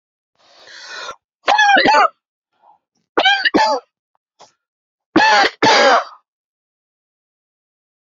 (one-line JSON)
{"three_cough_length": "8.0 s", "three_cough_amplitude": 30711, "three_cough_signal_mean_std_ratio": 0.42, "survey_phase": "alpha (2021-03-01 to 2021-08-12)", "age": "45-64", "gender": "Male", "wearing_mask": "No", "symptom_cough_any": true, "symptom_onset": "7 days", "smoker_status": "Never smoked", "respiratory_condition_asthma": false, "respiratory_condition_other": false, "recruitment_source": "Test and Trace", "submission_delay": "1 day", "covid_test_result": "Positive", "covid_test_method": "RT-qPCR", "covid_ct_value": 35.3, "covid_ct_gene": "ORF1ab gene"}